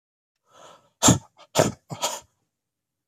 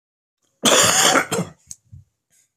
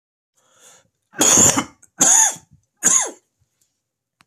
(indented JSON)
{
  "exhalation_length": "3.1 s",
  "exhalation_amplitude": 23579,
  "exhalation_signal_mean_std_ratio": 0.28,
  "cough_length": "2.6 s",
  "cough_amplitude": 28891,
  "cough_signal_mean_std_ratio": 0.45,
  "three_cough_length": "4.3 s",
  "three_cough_amplitude": 31826,
  "three_cough_signal_mean_std_ratio": 0.4,
  "survey_phase": "beta (2021-08-13 to 2022-03-07)",
  "age": "45-64",
  "gender": "Male",
  "wearing_mask": "No",
  "symptom_cough_any": true,
  "symptom_runny_or_blocked_nose": true,
  "symptom_sore_throat": true,
  "symptom_change_to_sense_of_smell_or_taste": true,
  "symptom_onset": "3 days",
  "smoker_status": "Ex-smoker",
  "respiratory_condition_asthma": false,
  "respiratory_condition_other": false,
  "recruitment_source": "Test and Trace",
  "submission_delay": "2 days",
  "covid_test_result": "Positive",
  "covid_test_method": "RT-qPCR",
  "covid_ct_value": 21.9,
  "covid_ct_gene": "ORF1ab gene",
  "covid_ct_mean": 22.4,
  "covid_viral_load": "44000 copies/ml",
  "covid_viral_load_category": "Low viral load (10K-1M copies/ml)"
}